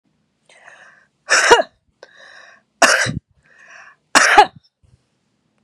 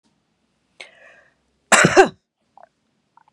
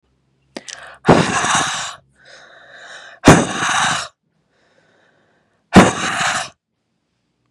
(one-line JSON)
{"three_cough_length": "5.6 s", "three_cough_amplitude": 32768, "three_cough_signal_mean_std_ratio": 0.32, "cough_length": "3.3 s", "cough_amplitude": 32768, "cough_signal_mean_std_ratio": 0.24, "exhalation_length": "7.5 s", "exhalation_amplitude": 32768, "exhalation_signal_mean_std_ratio": 0.38, "survey_phase": "beta (2021-08-13 to 2022-03-07)", "age": "45-64", "gender": "Female", "wearing_mask": "No", "symptom_none": true, "smoker_status": "Ex-smoker", "respiratory_condition_asthma": false, "respiratory_condition_other": false, "recruitment_source": "REACT", "submission_delay": "1 day", "covid_test_result": "Negative", "covid_test_method": "RT-qPCR", "influenza_a_test_result": "Negative", "influenza_b_test_result": "Negative"}